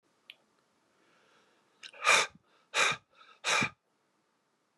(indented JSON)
{
  "exhalation_length": "4.8 s",
  "exhalation_amplitude": 8960,
  "exhalation_signal_mean_std_ratio": 0.31,
  "survey_phase": "beta (2021-08-13 to 2022-03-07)",
  "age": "45-64",
  "gender": "Male",
  "wearing_mask": "No",
  "symptom_none": true,
  "smoker_status": "Ex-smoker",
  "respiratory_condition_asthma": false,
  "respiratory_condition_other": false,
  "recruitment_source": "REACT",
  "submission_delay": "2 days",
  "covid_test_result": "Negative",
  "covid_test_method": "RT-qPCR"
}